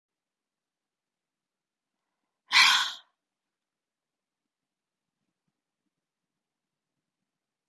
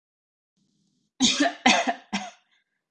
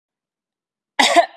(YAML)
exhalation_length: 7.7 s
exhalation_amplitude: 16499
exhalation_signal_mean_std_ratio: 0.17
three_cough_length: 2.9 s
three_cough_amplitude: 20468
three_cough_signal_mean_std_ratio: 0.38
cough_length: 1.4 s
cough_amplitude: 32768
cough_signal_mean_std_ratio: 0.33
survey_phase: beta (2021-08-13 to 2022-03-07)
age: 18-44
gender: Female
wearing_mask: 'No'
symptom_none: true
symptom_onset: 12 days
smoker_status: Never smoked
respiratory_condition_asthma: false
respiratory_condition_other: false
recruitment_source: REACT
submission_delay: 1 day
covid_test_result: Negative
covid_test_method: RT-qPCR
influenza_a_test_result: Negative
influenza_b_test_result: Negative